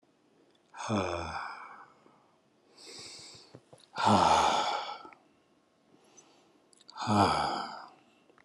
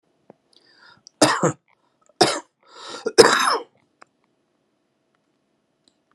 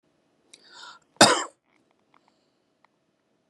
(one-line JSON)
{"exhalation_length": "8.4 s", "exhalation_amplitude": 10228, "exhalation_signal_mean_std_ratio": 0.43, "three_cough_length": "6.1 s", "three_cough_amplitude": 32768, "three_cough_signal_mean_std_ratio": 0.27, "cough_length": "3.5 s", "cough_amplitude": 29297, "cough_signal_mean_std_ratio": 0.18, "survey_phase": "alpha (2021-03-01 to 2021-08-12)", "age": "45-64", "gender": "Male", "wearing_mask": "No", "symptom_cough_any": true, "symptom_fatigue": true, "symptom_fever_high_temperature": true, "symptom_onset": "9 days", "smoker_status": "Ex-smoker", "respiratory_condition_asthma": false, "respiratory_condition_other": false, "recruitment_source": "Test and Trace", "submission_delay": "1 day", "covid_test_result": "Positive", "covid_test_method": "RT-qPCR", "covid_ct_value": 26.0, "covid_ct_gene": "ORF1ab gene", "covid_ct_mean": 26.2, "covid_viral_load": "2500 copies/ml", "covid_viral_load_category": "Minimal viral load (< 10K copies/ml)"}